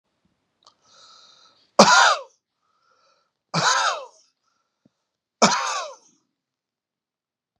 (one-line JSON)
{"three_cough_length": "7.6 s", "three_cough_amplitude": 32768, "three_cough_signal_mean_std_ratio": 0.29, "survey_phase": "beta (2021-08-13 to 2022-03-07)", "age": "65+", "gender": "Male", "wearing_mask": "No", "symptom_none": true, "smoker_status": "Ex-smoker", "respiratory_condition_asthma": false, "respiratory_condition_other": false, "recruitment_source": "REACT", "submission_delay": "1 day", "covid_test_result": "Negative", "covid_test_method": "RT-qPCR"}